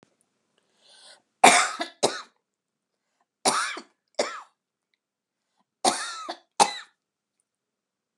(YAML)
three_cough_length: 8.2 s
three_cough_amplitude: 31113
three_cough_signal_mean_std_ratio: 0.26
survey_phase: beta (2021-08-13 to 2022-03-07)
age: 65+
gender: Female
wearing_mask: 'No'
symptom_none: true
smoker_status: Never smoked
respiratory_condition_asthma: false
respiratory_condition_other: false
recruitment_source: REACT
submission_delay: 1 day
covid_test_result: Negative
covid_test_method: RT-qPCR